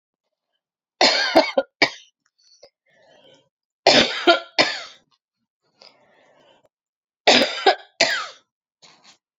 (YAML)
three_cough_length: 9.4 s
three_cough_amplitude: 32767
three_cough_signal_mean_std_ratio: 0.33
survey_phase: alpha (2021-03-01 to 2021-08-12)
age: 18-44
gender: Female
wearing_mask: 'No'
symptom_cough_any: true
symptom_headache: true
symptom_change_to_sense_of_smell_or_taste: true
symptom_onset: 4 days
smoker_status: Ex-smoker
respiratory_condition_asthma: false
respiratory_condition_other: false
recruitment_source: Test and Trace
submission_delay: 2 days
covid_test_result: Positive
covid_test_method: RT-qPCR
covid_ct_value: 17.6
covid_ct_gene: ORF1ab gene